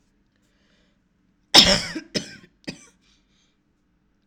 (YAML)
cough_length: 4.3 s
cough_amplitude: 32768
cough_signal_mean_std_ratio: 0.22
survey_phase: alpha (2021-03-01 to 2021-08-12)
age: 18-44
gender: Female
wearing_mask: 'No'
symptom_none: true
smoker_status: Never smoked
respiratory_condition_asthma: false
respiratory_condition_other: false
recruitment_source: REACT
submission_delay: 5 days
covid_test_result: Negative
covid_test_method: RT-qPCR